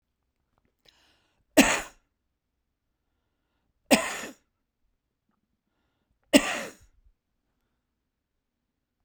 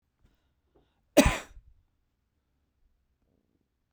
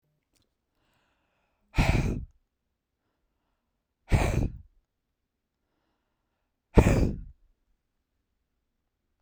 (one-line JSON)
{"three_cough_length": "9.0 s", "three_cough_amplitude": 24804, "three_cough_signal_mean_std_ratio": 0.19, "cough_length": "3.9 s", "cough_amplitude": 20471, "cough_signal_mean_std_ratio": 0.16, "exhalation_length": "9.2 s", "exhalation_amplitude": 27204, "exhalation_signal_mean_std_ratio": 0.26, "survey_phase": "beta (2021-08-13 to 2022-03-07)", "age": "45-64", "gender": "Male", "wearing_mask": "No", "symptom_none": true, "smoker_status": "Never smoked", "respiratory_condition_asthma": true, "respiratory_condition_other": false, "recruitment_source": "Test and Trace", "submission_delay": "1 day", "covid_test_result": "Negative", "covid_test_method": "LFT"}